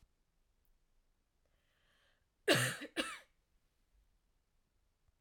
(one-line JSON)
{"cough_length": "5.2 s", "cough_amplitude": 5411, "cough_signal_mean_std_ratio": 0.23, "survey_phase": "alpha (2021-03-01 to 2021-08-12)", "age": "18-44", "gender": "Female", "wearing_mask": "No", "symptom_none": true, "smoker_status": "Current smoker (1 to 10 cigarettes per day)", "respiratory_condition_asthma": false, "respiratory_condition_other": false, "recruitment_source": "REACT", "submission_delay": "1 day", "covid_test_result": "Negative", "covid_test_method": "RT-qPCR"}